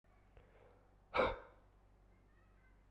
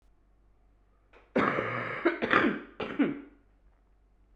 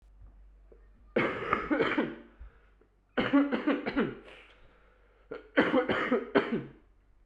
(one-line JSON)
{"exhalation_length": "2.9 s", "exhalation_amplitude": 2994, "exhalation_signal_mean_std_ratio": 0.28, "cough_length": "4.4 s", "cough_amplitude": 15225, "cough_signal_mean_std_ratio": 0.46, "three_cough_length": "7.3 s", "three_cough_amplitude": 10498, "three_cough_signal_mean_std_ratio": 0.51, "survey_phase": "beta (2021-08-13 to 2022-03-07)", "age": "18-44", "gender": "Male", "wearing_mask": "No", "symptom_cough_any": true, "symptom_runny_or_blocked_nose": true, "symptom_sore_throat": true, "symptom_fatigue": true, "symptom_headache": true, "symptom_onset": "2 days", "smoker_status": "Prefer not to say", "respiratory_condition_asthma": false, "respiratory_condition_other": false, "recruitment_source": "Test and Trace", "submission_delay": "2 days", "covid_test_result": "Positive", "covid_test_method": "RT-qPCR", "covid_ct_value": 32.2, "covid_ct_gene": "N gene"}